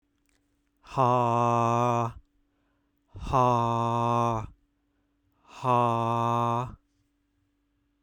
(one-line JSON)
{"exhalation_length": "8.0 s", "exhalation_amplitude": 10090, "exhalation_signal_mean_std_ratio": 0.58, "survey_phase": "beta (2021-08-13 to 2022-03-07)", "age": "18-44", "gender": "Male", "wearing_mask": "No", "symptom_cough_any": true, "smoker_status": "Never smoked", "respiratory_condition_asthma": false, "respiratory_condition_other": false, "recruitment_source": "REACT", "submission_delay": "1 day", "covid_test_result": "Negative", "covid_test_method": "RT-qPCR"}